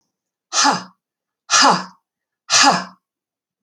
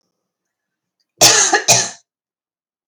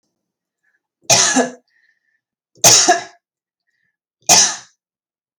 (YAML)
exhalation_length: 3.6 s
exhalation_amplitude: 30639
exhalation_signal_mean_std_ratio: 0.4
cough_length: 2.9 s
cough_amplitude: 32768
cough_signal_mean_std_ratio: 0.36
three_cough_length: 5.4 s
three_cough_amplitude: 32768
three_cough_signal_mean_std_ratio: 0.34
survey_phase: alpha (2021-03-01 to 2021-08-12)
age: 18-44
gender: Female
wearing_mask: 'No'
symptom_cough_any: true
symptom_shortness_of_breath: true
smoker_status: Never smoked
respiratory_condition_asthma: false
respiratory_condition_other: false
recruitment_source: REACT
submission_delay: 7 days
covid_test_result: Negative
covid_test_method: RT-qPCR